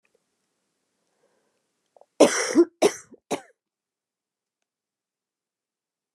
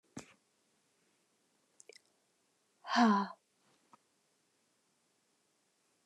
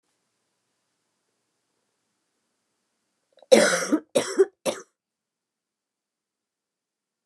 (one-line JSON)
{"cough_length": "6.1 s", "cough_amplitude": 25995, "cough_signal_mean_std_ratio": 0.21, "exhalation_length": "6.1 s", "exhalation_amplitude": 5604, "exhalation_signal_mean_std_ratio": 0.21, "three_cough_length": "7.3 s", "three_cough_amplitude": 27471, "three_cough_signal_mean_std_ratio": 0.22, "survey_phase": "beta (2021-08-13 to 2022-03-07)", "age": "45-64", "gender": "Female", "wearing_mask": "No", "symptom_cough_any": true, "symptom_new_continuous_cough": true, "symptom_runny_or_blocked_nose": true, "symptom_shortness_of_breath": true, "symptom_sore_throat": true, "symptom_abdominal_pain": true, "symptom_fatigue": true, "symptom_fever_high_temperature": true, "symptom_headache": true, "symptom_change_to_sense_of_smell_or_taste": true, "symptom_loss_of_taste": true, "symptom_other": true, "symptom_onset": "4 days", "smoker_status": "Ex-smoker", "respiratory_condition_asthma": true, "respiratory_condition_other": false, "recruitment_source": "Test and Trace", "submission_delay": "3 days", "covid_test_result": "Positive", "covid_test_method": "RT-qPCR", "covid_ct_value": 20.7, "covid_ct_gene": "ORF1ab gene", "covid_ct_mean": 21.6, "covid_viral_load": "81000 copies/ml", "covid_viral_load_category": "Low viral load (10K-1M copies/ml)"}